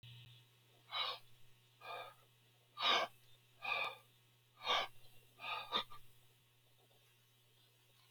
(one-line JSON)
{"exhalation_length": "8.1 s", "exhalation_amplitude": 2559, "exhalation_signal_mean_std_ratio": 0.4, "survey_phase": "beta (2021-08-13 to 2022-03-07)", "age": "65+", "gender": "Male", "wearing_mask": "No", "symptom_none": true, "smoker_status": "Never smoked", "respiratory_condition_asthma": false, "respiratory_condition_other": false, "recruitment_source": "REACT", "submission_delay": "2 days", "covid_test_result": "Negative", "covid_test_method": "RT-qPCR"}